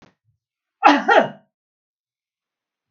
{"cough_length": "2.9 s", "cough_amplitude": 32768, "cough_signal_mean_std_ratio": 0.28, "survey_phase": "beta (2021-08-13 to 2022-03-07)", "age": "65+", "gender": "Female", "wearing_mask": "No", "symptom_none": true, "smoker_status": "Never smoked", "respiratory_condition_asthma": false, "respiratory_condition_other": false, "recruitment_source": "REACT", "submission_delay": "1 day", "covid_test_result": "Negative", "covid_test_method": "RT-qPCR", "influenza_a_test_result": "Negative", "influenza_b_test_result": "Negative"}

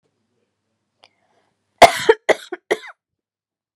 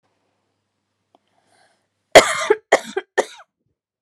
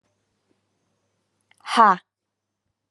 {"cough_length": "3.8 s", "cough_amplitude": 32768, "cough_signal_mean_std_ratio": 0.2, "three_cough_length": "4.0 s", "three_cough_amplitude": 32768, "three_cough_signal_mean_std_ratio": 0.22, "exhalation_length": "2.9 s", "exhalation_amplitude": 27017, "exhalation_signal_mean_std_ratio": 0.2, "survey_phase": "alpha (2021-03-01 to 2021-08-12)", "age": "18-44", "gender": "Female", "wearing_mask": "No", "symptom_none": true, "smoker_status": "Never smoked", "respiratory_condition_asthma": false, "respiratory_condition_other": false, "recruitment_source": "REACT", "submission_delay": "2 days", "covid_test_result": "Negative", "covid_test_method": "RT-qPCR"}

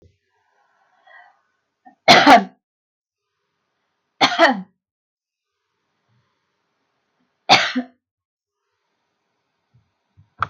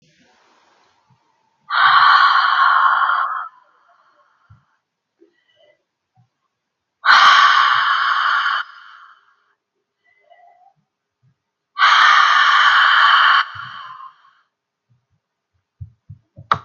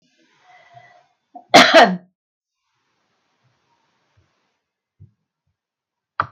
{"three_cough_length": "10.5 s", "three_cough_amplitude": 32768, "three_cough_signal_mean_std_ratio": 0.23, "exhalation_length": "16.6 s", "exhalation_amplitude": 32768, "exhalation_signal_mean_std_ratio": 0.47, "cough_length": "6.3 s", "cough_amplitude": 32768, "cough_signal_mean_std_ratio": 0.21, "survey_phase": "beta (2021-08-13 to 2022-03-07)", "age": "65+", "gender": "Female", "wearing_mask": "No", "symptom_none": true, "smoker_status": "Ex-smoker", "respiratory_condition_asthma": false, "respiratory_condition_other": false, "recruitment_source": "REACT", "submission_delay": "2 days", "covid_test_result": "Negative", "covid_test_method": "RT-qPCR", "influenza_a_test_result": "Negative", "influenza_b_test_result": "Negative"}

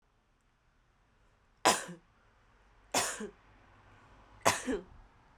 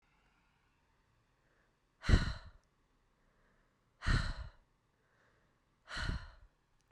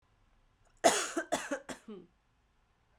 {"three_cough_length": "5.4 s", "three_cough_amplitude": 13251, "three_cough_signal_mean_std_ratio": 0.29, "exhalation_length": "6.9 s", "exhalation_amplitude": 5934, "exhalation_signal_mean_std_ratio": 0.26, "cough_length": "3.0 s", "cough_amplitude": 10766, "cough_signal_mean_std_ratio": 0.32, "survey_phase": "beta (2021-08-13 to 2022-03-07)", "age": "18-44", "gender": "Female", "wearing_mask": "No", "symptom_cough_any": true, "symptom_runny_or_blocked_nose": true, "symptom_fatigue": true, "symptom_fever_high_temperature": true, "symptom_headache": true, "symptom_change_to_sense_of_smell_or_taste": true, "symptom_onset": "2 days", "smoker_status": "Never smoked", "respiratory_condition_asthma": false, "respiratory_condition_other": false, "recruitment_source": "Test and Trace", "submission_delay": "1 day", "covid_test_result": "Positive", "covid_test_method": "RT-qPCR", "covid_ct_value": 21.6, "covid_ct_gene": "ORF1ab gene"}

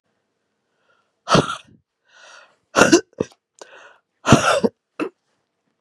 {"exhalation_length": "5.8 s", "exhalation_amplitude": 32768, "exhalation_signal_mean_std_ratio": 0.29, "survey_phase": "beta (2021-08-13 to 2022-03-07)", "age": "65+", "gender": "Female", "wearing_mask": "No", "symptom_cough_any": true, "symptom_runny_or_blocked_nose": true, "symptom_shortness_of_breath": true, "symptom_fatigue": true, "symptom_headache": true, "symptom_other": true, "symptom_onset": "3 days", "smoker_status": "Ex-smoker", "respiratory_condition_asthma": false, "respiratory_condition_other": false, "recruitment_source": "Test and Trace", "submission_delay": "1 day", "covid_test_result": "Positive", "covid_test_method": "RT-qPCR", "covid_ct_value": 23.9, "covid_ct_gene": "N gene", "covid_ct_mean": 24.2, "covid_viral_load": "12000 copies/ml", "covid_viral_load_category": "Low viral load (10K-1M copies/ml)"}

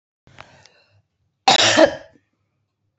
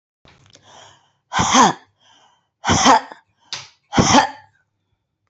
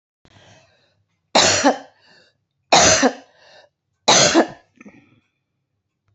{"cough_length": "3.0 s", "cough_amplitude": 31925, "cough_signal_mean_std_ratio": 0.3, "exhalation_length": "5.3 s", "exhalation_amplitude": 30632, "exhalation_signal_mean_std_ratio": 0.37, "three_cough_length": "6.1 s", "three_cough_amplitude": 29972, "three_cough_signal_mean_std_ratio": 0.36, "survey_phase": "beta (2021-08-13 to 2022-03-07)", "age": "45-64", "gender": "Female", "wearing_mask": "No", "symptom_cough_any": true, "symptom_runny_or_blocked_nose": true, "smoker_status": "Never smoked", "respiratory_condition_asthma": false, "respiratory_condition_other": false, "recruitment_source": "Test and Trace", "submission_delay": "1 day", "covid_test_result": "Positive", "covid_test_method": "RT-qPCR", "covid_ct_value": 24.1, "covid_ct_gene": "ORF1ab gene", "covid_ct_mean": 24.6, "covid_viral_load": "8500 copies/ml", "covid_viral_load_category": "Minimal viral load (< 10K copies/ml)"}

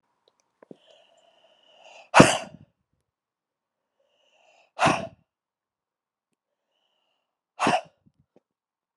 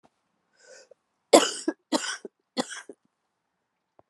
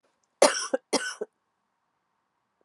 {"exhalation_length": "9.0 s", "exhalation_amplitude": 32768, "exhalation_signal_mean_std_ratio": 0.19, "three_cough_length": "4.1 s", "three_cough_amplitude": 28944, "three_cough_signal_mean_std_ratio": 0.22, "cough_length": "2.6 s", "cough_amplitude": 20371, "cough_signal_mean_std_ratio": 0.27, "survey_phase": "beta (2021-08-13 to 2022-03-07)", "age": "45-64", "gender": "Female", "wearing_mask": "No", "symptom_cough_any": true, "symptom_runny_or_blocked_nose": true, "symptom_sore_throat": true, "symptom_fatigue": true, "symptom_headache": true, "symptom_change_to_sense_of_smell_or_taste": true, "symptom_other": true, "symptom_onset": "3 days", "smoker_status": "Current smoker (e-cigarettes or vapes only)", "respiratory_condition_asthma": false, "respiratory_condition_other": false, "recruitment_source": "Test and Trace", "submission_delay": "2 days", "covid_test_result": "Positive", "covid_test_method": "RT-qPCR"}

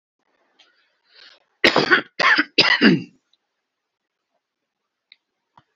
{"cough_length": "5.8 s", "cough_amplitude": 30784, "cough_signal_mean_std_ratio": 0.31, "survey_phase": "beta (2021-08-13 to 2022-03-07)", "age": "65+", "gender": "Male", "wearing_mask": "No", "symptom_none": true, "smoker_status": "Never smoked", "respiratory_condition_asthma": false, "respiratory_condition_other": false, "recruitment_source": "REACT", "submission_delay": "1 day", "covid_test_result": "Negative", "covid_test_method": "RT-qPCR", "influenza_a_test_result": "Unknown/Void", "influenza_b_test_result": "Unknown/Void"}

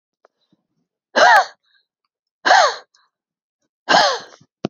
{"exhalation_length": "4.7 s", "exhalation_amplitude": 31094, "exhalation_signal_mean_std_ratio": 0.35, "survey_phase": "beta (2021-08-13 to 2022-03-07)", "age": "18-44", "gender": "Female", "wearing_mask": "No", "symptom_runny_or_blocked_nose": true, "symptom_onset": "8 days", "smoker_status": "Never smoked", "respiratory_condition_asthma": true, "respiratory_condition_other": false, "recruitment_source": "REACT", "submission_delay": "1 day", "covid_test_result": "Negative", "covid_test_method": "RT-qPCR", "influenza_a_test_result": "Negative", "influenza_b_test_result": "Negative"}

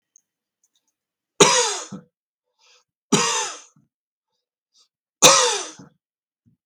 {"three_cough_length": "6.7 s", "three_cough_amplitude": 32768, "three_cough_signal_mean_std_ratio": 0.3, "survey_phase": "beta (2021-08-13 to 2022-03-07)", "age": "45-64", "gender": "Male", "wearing_mask": "No", "symptom_none": true, "smoker_status": "Never smoked", "respiratory_condition_asthma": false, "respiratory_condition_other": false, "recruitment_source": "REACT", "submission_delay": "2 days", "covid_test_result": "Negative", "covid_test_method": "RT-qPCR"}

